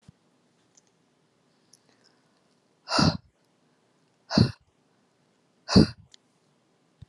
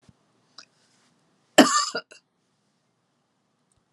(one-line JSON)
{"exhalation_length": "7.1 s", "exhalation_amplitude": 21661, "exhalation_signal_mean_std_ratio": 0.21, "cough_length": "3.9 s", "cough_amplitude": 30774, "cough_signal_mean_std_ratio": 0.2, "survey_phase": "alpha (2021-03-01 to 2021-08-12)", "age": "65+", "gender": "Female", "wearing_mask": "No", "symptom_none": true, "smoker_status": "Never smoked", "respiratory_condition_asthma": false, "respiratory_condition_other": false, "recruitment_source": "REACT", "submission_delay": "2 days", "covid_test_result": "Negative", "covid_test_method": "RT-qPCR"}